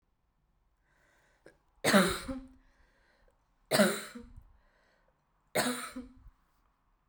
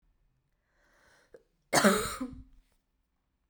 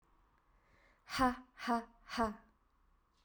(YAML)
three_cough_length: 7.1 s
three_cough_amplitude: 8959
three_cough_signal_mean_std_ratio: 0.3
cough_length: 3.5 s
cough_amplitude: 12127
cough_signal_mean_std_ratio: 0.28
exhalation_length: 3.2 s
exhalation_amplitude: 3539
exhalation_signal_mean_std_ratio: 0.36
survey_phase: beta (2021-08-13 to 2022-03-07)
age: 18-44
gender: Female
wearing_mask: 'No'
symptom_runny_or_blocked_nose: true
symptom_diarrhoea: true
symptom_fatigue: true
symptom_fever_high_temperature: true
symptom_headache: true
smoker_status: Never smoked
respiratory_condition_asthma: false
respiratory_condition_other: false
recruitment_source: Test and Trace
submission_delay: 2 days
covid_test_result: Positive
covid_test_method: RT-qPCR
covid_ct_value: 18.3
covid_ct_gene: ORF1ab gene
covid_ct_mean: 18.5
covid_viral_load: 860000 copies/ml
covid_viral_load_category: Low viral load (10K-1M copies/ml)